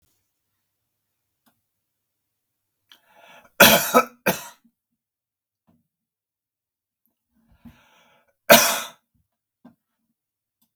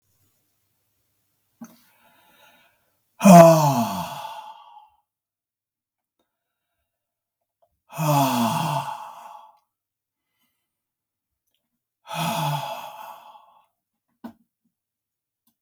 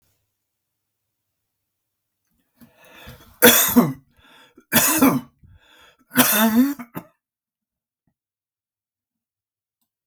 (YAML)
cough_length: 10.8 s
cough_amplitude: 32768
cough_signal_mean_std_ratio: 0.19
exhalation_length: 15.6 s
exhalation_amplitude: 32768
exhalation_signal_mean_std_ratio: 0.25
three_cough_length: 10.1 s
three_cough_amplitude: 32768
three_cough_signal_mean_std_ratio: 0.31
survey_phase: beta (2021-08-13 to 2022-03-07)
age: 65+
gender: Male
wearing_mask: 'No'
symptom_none: true
smoker_status: Never smoked
respiratory_condition_asthma: false
respiratory_condition_other: false
recruitment_source: REACT
submission_delay: 1 day
covid_test_result: Negative
covid_test_method: RT-qPCR